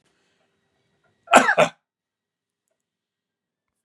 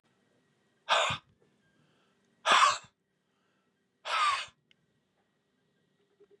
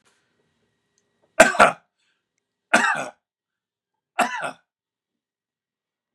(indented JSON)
{
  "cough_length": "3.8 s",
  "cough_amplitude": 32767,
  "cough_signal_mean_std_ratio": 0.21,
  "exhalation_length": "6.4 s",
  "exhalation_amplitude": 10717,
  "exhalation_signal_mean_std_ratio": 0.3,
  "three_cough_length": "6.1 s",
  "three_cough_amplitude": 32768,
  "three_cough_signal_mean_std_ratio": 0.24,
  "survey_phase": "beta (2021-08-13 to 2022-03-07)",
  "age": "65+",
  "gender": "Male",
  "wearing_mask": "No",
  "symptom_none": true,
  "smoker_status": "Never smoked",
  "respiratory_condition_asthma": true,
  "respiratory_condition_other": false,
  "recruitment_source": "REACT",
  "submission_delay": "2 days",
  "covid_test_result": "Negative",
  "covid_test_method": "RT-qPCR",
  "influenza_a_test_result": "Negative",
  "influenza_b_test_result": "Negative"
}